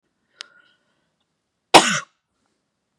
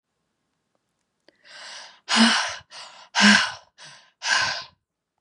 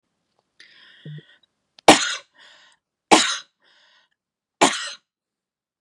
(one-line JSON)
{"cough_length": "3.0 s", "cough_amplitude": 32768, "cough_signal_mean_std_ratio": 0.18, "exhalation_length": "5.2 s", "exhalation_amplitude": 25879, "exhalation_signal_mean_std_ratio": 0.37, "three_cough_length": "5.8 s", "three_cough_amplitude": 32768, "three_cough_signal_mean_std_ratio": 0.23, "survey_phase": "beta (2021-08-13 to 2022-03-07)", "age": "18-44", "gender": "Female", "wearing_mask": "No", "symptom_none": true, "smoker_status": "Current smoker (e-cigarettes or vapes only)", "respiratory_condition_asthma": false, "respiratory_condition_other": false, "recruitment_source": "REACT", "submission_delay": "1 day", "covid_test_result": "Negative", "covid_test_method": "RT-qPCR", "influenza_a_test_result": "Negative", "influenza_b_test_result": "Negative"}